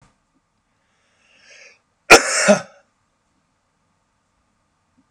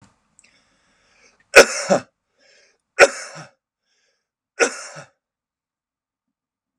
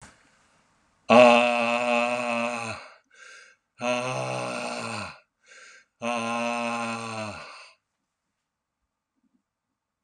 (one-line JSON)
{"cough_length": "5.1 s", "cough_amplitude": 32768, "cough_signal_mean_std_ratio": 0.2, "three_cough_length": "6.8 s", "three_cough_amplitude": 32768, "three_cough_signal_mean_std_ratio": 0.19, "exhalation_length": "10.0 s", "exhalation_amplitude": 29435, "exhalation_signal_mean_std_ratio": 0.42, "survey_phase": "beta (2021-08-13 to 2022-03-07)", "age": "45-64", "gender": "Male", "wearing_mask": "No", "symptom_none": true, "smoker_status": "Ex-smoker", "respiratory_condition_asthma": false, "respiratory_condition_other": false, "recruitment_source": "REACT", "submission_delay": "4 days", "covid_test_result": "Negative", "covid_test_method": "RT-qPCR"}